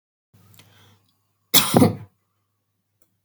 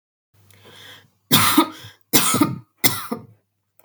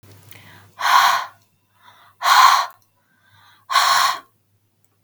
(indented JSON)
{
  "cough_length": "3.2 s",
  "cough_amplitude": 32768,
  "cough_signal_mean_std_ratio": 0.26,
  "three_cough_length": "3.8 s",
  "three_cough_amplitude": 32768,
  "three_cough_signal_mean_std_ratio": 0.41,
  "exhalation_length": "5.0 s",
  "exhalation_amplitude": 31995,
  "exhalation_signal_mean_std_ratio": 0.43,
  "survey_phase": "beta (2021-08-13 to 2022-03-07)",
  "age": "18-44",
  "gender": "Female",
  "wearing_mask": "No",
  "symptom_none": true,
  "smoker_status": "Current smoker (1 to 10 cigarettes per day)",
  "respiratory_condition_asthma": false,
  "respiratory_condition_other": false,
  "recruitment_source": "REACT",
  "submission_delay": "3 days",
  "covid_test_result": "Negative",
  "covid_test_method": "RT-qPCR",
  "influenza_a_test_result": "Negative",
  "influenza_b_test_result": "Negative"
}